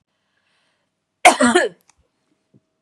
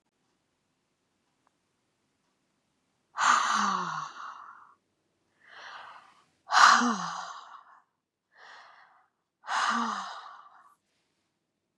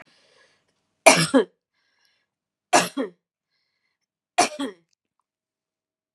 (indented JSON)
{
  "cough_length": "2.8 s",
  "cough_amplitude": 32768,
  "cough_signal_mean_std_ratio": 0.28,
  "exhalation_length": "11.8 s",
  "exhalation_amplitude": 21378,
  "exhalation_signal_mean_std_ratio": 0.32,
  "three_cough_length": "6.1 s",
  "three_cough_amplitude": 32768,
  "three_cough_signal_mean_std_ratio": 0.24,
  "survey_phase": "beta (2021-08-13 to 2022-03-07)",
  "age": "45-64",
  "gender": "Female",
  "wearing_mask": "No",
  "symptom_none": true,
  "smoker_status": "Ex-smoker",
  "respiratory_condition_asthma": false,
  "respiratory_condition_other": false,
  "recruitment_source": "REACT",
  "submission_delay": "3 days",
  "covid_test_result": "Negative",
  "covid_test_method": "RT-qPCR",
  "influenza_a_test_result": "Unknown/Void",
  "influenza_b_test_result": "Unknown/Void"
}